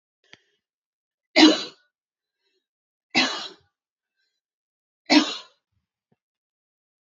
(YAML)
three_cough_length: 7.2 s
three_cough_amplitude: 25334
three_cough_signal_mean_std_ratio: 0.22
survey_phase: beta (2021-08-13 to 2022-03-07)
age: 18-44
gender: Female
wearing_mask: 'No'
symptom_fatigue: true
symptom_headache: true
symptom_onset: 12 days
smoker_status: Ex-smoker
respiratory_condition_asthma: false
respiratory_condition_other: false
recruitment_source: REACT
submission_delay: 1 day
covid_test_result: Negative
covid_test_method: RT-qPCR
influenza_a_test_result: Negative
influenza_b_test_result: Negative